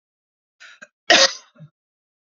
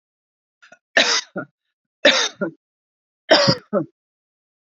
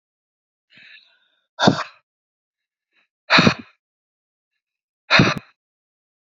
cough_length: 2.3 s
cough_amplitude: 32767
cough_signal_mean_std_ratio: 0.24
three_cough_length: 4.6 s
three_cough_amplitude: 29827
three_cough_signal_mean_std_ratio: 0.35
exhalation_length: 6.4 s
exhalation_amplitude: 30428
exhalation_signal_mean_std_ratio: 0.25
survey_phase: alpha (2021-03-01 to 2021-08-12)
age: 45-64
gender: Female
wearing_mask: 'No'
symptom_none: true
smoker_status: Ex-smoker
respiratory_condition_asthma: false
respiratory_condition_other: false
recruitment_source: REACT
submission_delay: 3 days
covid_test_result: Negative
covid_test_method: RT-qPCR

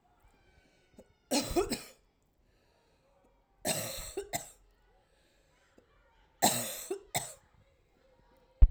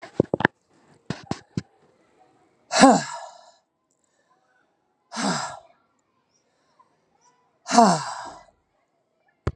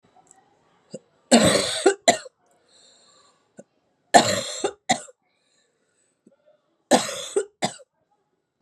three_cough_length: 8.7 s
three_cough_amplitude: 14688
three_cough_signal_mean_std_ratio: 0.25
exhalation_length: 9.6 s
exhalation_amplitude: 32767
exhalation_signal_mean_std_ratio: 0.25
cough_length: 8.6 s
cough_amplitude: 32767
cough_signal_mean_std_ratio: 0.3
survey_phase: alpha (2021-03-01 to 2021-08-12)
age: 45-64
gender: Female
wearing_mask: 'No'
symptom_cough_any: true
symptom_fatigue: true
symptom_fever_high_temperature: true
smoker_status: Never smoked
respiratory_condition_asthma: false
respiratory_condition_other: false
recruitment_source: Test and Trace
submission_delay: 1 day
covid_test_result: Positive
covid_test_method: RT-qPCR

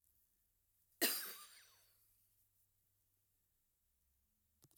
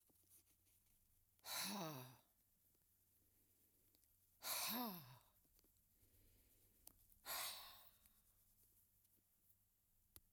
cough_length: 4.8 s
cough_amplitude: 2597
cough_signal_mean_std_ratio: 0.22
exhalation_length: 10.3 s
exhalation_amplitude: 733
exhalation_signal_mean_std_ratio: 0.39
survey_phase: alpha (2021-03-01 to 2021-08-12)
age: 65+
gender: Female
wearing_mask: 'No'
symptom_none: true
smoker_status: Never smoked
respiratory_condition_asthma: false
respiratory_condition_other: false
recruitment_source: REACT
submission_delay: 1 day
covid_test_result: Negative
covid_test_method: RT-qPCR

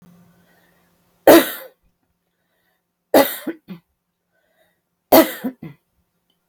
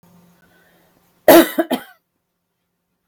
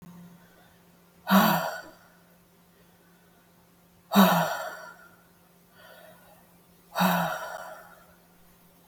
three_cough_length: 6.5 s
three_cough_amplitude: 32768
three_cough_signal_mean_std_ratio: 0.24
cough_length: 3.1 s
cough_amplitude: 32768
cough_signal_mean_std_ratio: 0.25
exhalation_length: 8.9 s
exhalation_amplitude: 16407
exhalation_signal_mean_std_ratio: 0.34
survey_phase: beta (2021-08-13 to 2022-03-07)
age: 45-64
gender: Female
wearing_mask: 'No'
symptom_none: true
smoker_status: Ex-smoker
respiratory_condition_asthma: false
respiratory_condition_other: false
recruitment_source: REACT
submission_delay: 2 days
covid_test_result: Negative
covid_test_method: RT-qPCR
influenza_a_test_result: Negative
influenza_b_test_result: Negative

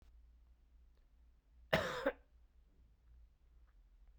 cough_length: 4.2 s
cough_amplitude: 3794
cough_signal_mean_std_ratio: 0.3
survey_phase: beta (2021-08-13 to 2022-03-07)
age: 18-44
gender: Male
wearing_mask: 'No'
symptom_cough_any: true
symptom_runny_or_blocked_nose: true
symptom_sore_throat: true
symptom_fatigue: true
symptom_headache: true
symptom_onset: 3 days
smoker_status: Never smoked
respiratory_condition_asthma: false
respiratory_condition_other: false
recruitment_source: Test and Trace
submission_delay: 2 days
covid_test_result: Positive
covid_test_method: RT-qPCR
covid_ct_value: 32.3
covid_ct_gene: N gene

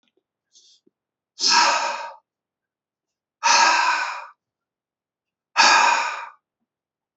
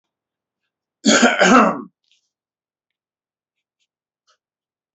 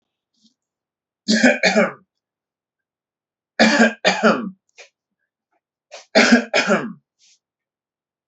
exhalation_length: 7.2 s
exhalation_amplitude: 26236
exhalation_signal_mean_std_ratio: 0.42
cough_length: 4.9 s
cough_amplitude: 30589
cough_signal_mean_std_ratio: 0.29
three_cough_length: 8.3 s
three_cough_amplitude: 29579
three_cough_signal_mean_std_ratio: 0.37
survey_phase: beta (2021-08-13 to 2022-03-07)
age: 18-44
gender: Male
wearing_mask: 'No'
symptom_none: true
smoker_status: Never smoked
respiratory_condition_asthma: true
respiratory_condition_other: false
recruitment_source: REACT
submission_delay: 1 day
covid_test_result: Negative
covid_test_method: RT-qPCR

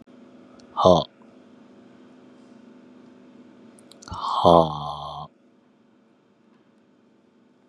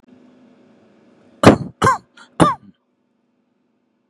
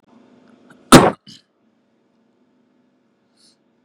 exhalation_length: 7.7 s
exhalation_amplitude: 29427
exhalation_signal_mean_std_ratio: 0.27
three_cough_length: 4.1 s
three_cough_amplitude: 32768
three_cough_signal_mean_std_ratio: 0.26
cough_length: 3.8 s
cough_amplitude: 32768
cough_signal_mean_std_ratio: 0.18
survey_phase: beta (2021-08-13 to 2022-03-07)
age: 18-44
gender: Male
wearing_mask: 'Yes'
symptom_none: true
smoker_status: Never smoked
respiratory_condition_asthma: false
respiratory_condition_other: false
recruitment_source: REACT
submission_delay: 1 day
covid_test_result: Negative
covid_test_method: RT-qPCR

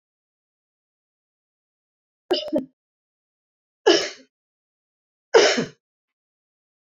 three_cough_length: 6.9 s
three_cough_amplitude: 26199
three_cough_signal_mean_std_ratio: 0.24
survey_phase: beta (2021-08-13 to 2022-03-07)
age: 65+
gender: Female
wearing_mask: 'No'
symptom_none: true
smoker_status: Never smoked
respiratory_condition_asthma: false
respiratory_condition_other: false
recruitment_source: REACT
submission_delay: 2 days
covid_test_result: Negative
covid_test_method: RT-qPCR
influenza_a_test_result: Negative
influenza_b_test_result: Negative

